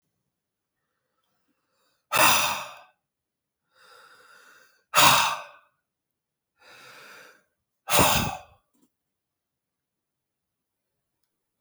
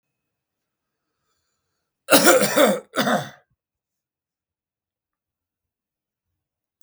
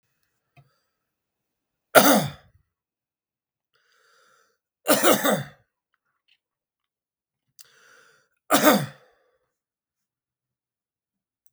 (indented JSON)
{
  "exhalation_length": "11.6 s",
  "exhalation_amplitude": 21947,
  "exhalation_signal_mean_std_ratio": 0.27,
  "cough_length": "6.8 s",
  "cough_amplitude": 32768,
  "cough_signal_mean_std_ratio": 0.27,
  "three_cough_length": "11.5 s",
  "three_cough_amplitude": 32768,
  "three_cough_signal_mean_std_ratio": 0.24,
  "survey_phase": "beta (2021-08-13 to 2022-03-07)",
  "age": "45-64",
  "gender": "Male",
  "wearing_mask": "No",
  "symptom_cough_any": true,
  "symptom_runny_or_blocked_nose": true,
  "symptom_fatigue": true,
  "symptom_headache": true,
  "smoker_status": "Never smoked",
  "respiratory_condition_asthma": true,
  "respiratory_condition_other": false,
  "recruitment_source": "Test and Trace",
  "submission_delay": "2 days",
  "covid_test_result": "Positive",
  "covid_test_method": "RT-qPCR",
  "covid_ct_value": 12.5,
  "covid_ct_gene": "ORF1ab gene",
  "covid_ct_mean": 12.9,
  "covid_viral_load": "61000000 copies/ml",
  "covid_viral_load_category": "High viral load (>1M copies/ml)"
}